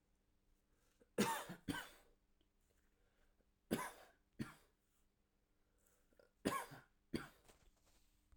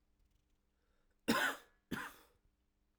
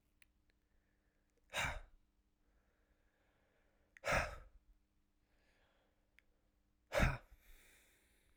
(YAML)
three_cough_length: 8.4 s
three_cough_amplitude: 2074
three_cough_signal_mean_std_ratio: 0.3
cough_length: 3.0 s
cough_amplitude: 3462
cough_signal_mean_std_ratio: 0.3
exhalation_length: 8.4 s
exhalation_amplitude: 3197
exhalation_signal_mean_std_ratio: 0.25
survey_phase: alpha (2021-03-01 to 2021-08-12)
age: 18-44
gender: Male
wearing_mask: 'No'
symptom_new_continuous_cough: true
symptom_fatigue: true
symptom_change_to_sense_of_smell_or_taste: true
smoker_status: Never smoked
respiratory_condition_asthma: false
respiratory_condition_other: false
recruitment_source: Test and Trace
submission_delay: 1 day
covid_test_result: Positive
covid_test_method: RT-qPCR
covid_ct_value: 26.8
covid_ct_gene: ORF1ab gene